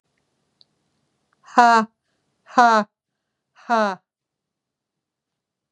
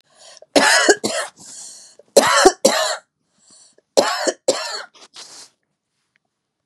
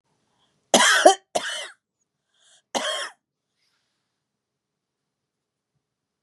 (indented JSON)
{
  "exhalation_length": "5.7 s",
  "exhalation_amplitude": 32301,
  "exhalation_signal_mean_std_ratio": 0.27,
  "three_cough_length": "6.7 s",
  "three_cough_amplitude": 32768,
  "three_cough_signal_mean_std_ratio": 0.4,
  "cough_length": "6.2 s",
  "cough_amplitude": 31981,
  "cough_signal_mean_std_ratio": 0.25,
  "survey_phase": "beta (2021-08-13 to 2022-03-07)",
  "age": "65+",
  "gender": "Female",
  "wearing_mask": "No",
  "symptom_none": true,
  "smoker_status": "Never smoked",
  "respiratory_condition_asthma": false,
  "respiratory_condition_other": false,
  "recruitment_source": "REACT",
  "submission_delay": "2 days",
  "covid_test_result": "Negative",
  "covid_test_method": "RT-qPCR",
  "influenza_a_test_result": "Unknown/Void",
  "influenza_b_test_result": "Unknown/Void"
}